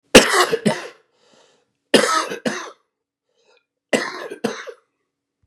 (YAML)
three_cough_length: 5.5 s
three_cough_amplitude: 32768
three_cough_signal_mean_std_ratio: 0.34
survey_phase: beta (2021-08-13 to 2022-03-07)
age: 65+
gender: Male
wearing_mask: 'No'
symptom_cough_any: true
symptom_runny_or_blocked_nose: true
symptom_diarrhoea: true
symptom_fatigue: true
symptom_fever_high_temperature: true
symptom_change_to_sense_of_smell_or_taste: true
symptom_loss_of_taste: true
symptom_onset: 8 days
smoker_status: Never smoked
respiratory_condition_asthma: false
respiratory_condition_other: false
recruitment_source: Test and Trace
submission_delay: 3 days
covid_test_result: Positive
covid_test_method: RT-qPCR